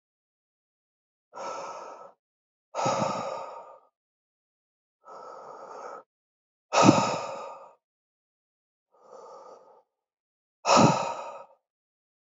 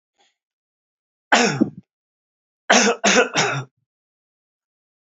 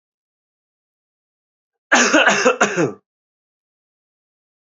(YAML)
exhalation_length: 12.2 s
exhalation_amplitude: 25255
exhalation_signal_mean_std_ratio: 0.31
three_cough_length: 5.1 s
three_cough_amplitude: 32067
three_cough_signal_mean_std_ratio: 0.35
cough_length: 4.8 s
cough_amplitude: 30852
cough_signal_mean_std_ratio: 0.34
survey_phase: beta (2021-08-13 to 2022-03-07)
age: 18-44
gender: Male
wearing_mask: 'No'
symptom_cough_any: true
symptom_new_continuous_cough: true
symptom_fatigue: true
symptom_headache: true
symptom_onset: 3 days
smoker_status: Never smoked
respiratory_condition_asthma: false
respiratory_condition_other: false
recruitment_source: Test and Trace
submission_delay: 1 day
covid_test_result: Positive
covid_test_method: RT-qPCR
covid_ct_value: 16.9
covid_ct_gene: N gene